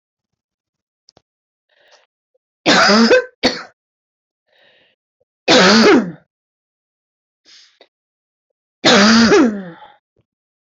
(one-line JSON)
{"three_cough_length": "10.7 s", "three_cough_amplitude": 30921, "three_cough_signal_mean_std_ratio": 0.39, "survey_phase": "alpha (2021-03-01 to 2021-08-12)", "age": "45-64", "gender": "Female", "wearing_mask": "No", "symptom_none": true, "smoker_status": "Ex-smoker", "respiratory_condition_asthma": false, "respiratory_condition_other": false, "recruitment_source": "REACT", "submission_delay": "1 day", "covid_test_result": "Negative", "covid_test_method": "RT-qPCR"}